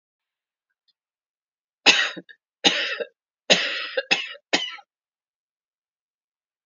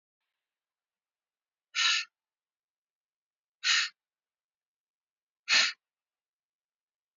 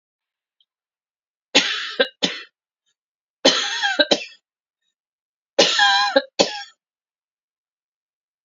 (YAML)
cough_length: 6.7 s
cough_amplitude: 32767
cough_signal_mean_std_ratio: 0.3
exhalation_length: 7.2 s
exhalation_amplitude: 9359
exhalation_signal_mean_std_ratio: 0.25
three_cough_length: 8.4 s
three_cough_amplitude: 32767
three_cough_signal_mean_std_ratio: 0.35
survey_phase: beta (2021-08-13 to 2022-03-07)
age: 65+
gender: Female
wearing_mask: 'No'
symptom_shortness_of_breath: true
symptom_change_to_sense_of_smell_or_taste: true
smoker_status: Ex-smoker
respiratory_condition_asthma: false
respiratory_condition_other: false
recruitment_source: REACT
submission_delay: 1 day
covid_test_result: Negative
covid_test_method: RT-qPCR
influenza_a_test_result: Negative
influenza_b_test_result: Negative